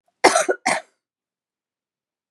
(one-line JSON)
{"cough_length": "2.3 s", "cough_amplitude": 32768, "cough_signal_mean_std_ratio": 0.29, "survey_phase": "beta (2021-08-13 to 2022-03-07)", "age": "65+", "gender": "Female", "wearing_mask": "No", "symptom_cough_any": true, "smoker_status": "Ex-smoker", "respiratory_condition_asthma": false, "respiratory_condition_other": false, "recruitment_source": "REACT", "submission_delay": "4 days", "covid_test_result": "Negative", "covid_test_method": "RT-qPCR", "influenza_a_test_result": "Negative", "influenza_b_test_result": "Negative"}